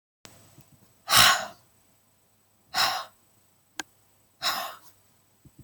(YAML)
exhalation_length: 5.6 s
exhalation_amplitude: 20511
exhalation_signal_mean_std_ratio: 0.29
survey_phase: beta (2021-08-13 to 2022-03-07)
age: 18-44
gender: Female
wearing_mask: 'No'
symptom_cough_any: true
symptom_runny_or_blocked_nose: true
symptom_sore_throat: true
symptom_diarrhoea: true
symptom_fatigue: true
symptom_headache: true
symptom_other: true
smoker_status: Never smoked
respiratory_condition_asthma: false
respiratory_condition_other: false
recruitment_source: Test and Trace
submission_delay: 2 days
covid_test_result: Positive
covid_test_method: RT-qPCR
covid_ct_value: 31.4
covid_ct_gene: N gene